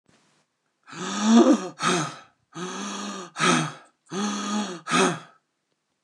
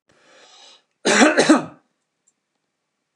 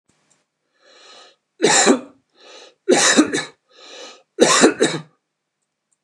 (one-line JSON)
{"exhalation_length": "6.0 s", "exhalation_amplitude": 17128, "exhalation_signal_mean_std_ratio": 0.5, "cough_length": "3.2 s", "cough_amplitude": 29117, "cough_signal_mean_std_ratio": 0.33, "three_cough_length": "6.0 s", "three_cough_amplitude": 29204, "three_cough_signal_mean_std_ratio": 0.39, "survey_phase": "alpha (2021-03-01 to 2021-08-12)", "age": "65+", "gender": "Male", "wearing_mask": "No", "symptom_none": true, "smoker_status": "Ex-smoker", "respiratory_condition_asthma": false, "respiratory_condition_other": false, "recruitment_source": "REACT", "submission_delay": "1 day", "covid_test_result": "Negative", "covid_test_method": "RT-qPCR"}